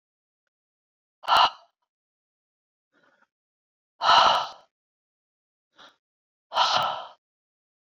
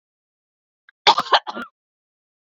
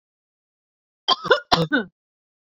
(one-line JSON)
{"exhalation_length": "7.9 s", "exhalation_amplitude": 19826, "exhalation_signal_mean_std_ratio": 0.29, "cough_length": "2.5 s", "cough_amplitude": 31234, "cough_signal_mean_std_ratio": 0.24, "three_cough_length": "2.6 s", "three_cough_amplitude": 32643, "three_cough_signal_mean_std_ratio": 0.31, "survey_phase": "beta (2021-08-13 to 2022-03-07)", "age": "45-64", "gender": "Female", "wearing_mask": "No", "symptom_none": true, "smoker_status": "Never smoked", "respiratory_condition_asthma": false, "respiratory_condition_other": false, "recruitment_source": "REACT", "submission_delay": "1 day", "covid_test_result": "Negative", "covid_test_method": "RT-qPCR", "influenza_a_test_result": "Negative", "influenza_b_test_result": "Negative"}